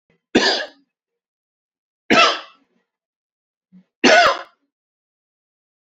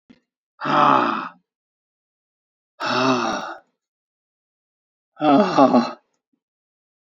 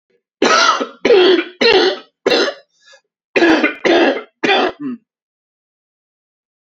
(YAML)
three_cough_length: 6.0 s
three_cough_amplitude: 29285
three_cough_signal_mean_std_ratio: 0.3
exhalation_length: 7.1 s
exhalation_amplitude: 31451
exhalation_signal_mean_std_ratio: 0.4
cough_length: 6.7 s
cough_amplitude: 32767
cough_signal_mean_std_ratio: 0.53
survey_phase: alpha (2021-03-01 to 2021-08-12)
age: 45-64
gender: Male
wearing_mask: 'No'
symptom_shortness_of_breath: true
symptom_fatigue: true
symptom_onset: 12 days
smoker_status: Ex-smoker
respiratory_condition_asthma: false
respiratory_condition_other: false
recruitment_source: REACT
submission_delay: 1 day
covid_test_result: Negative
covid_test_method: RT-qPCR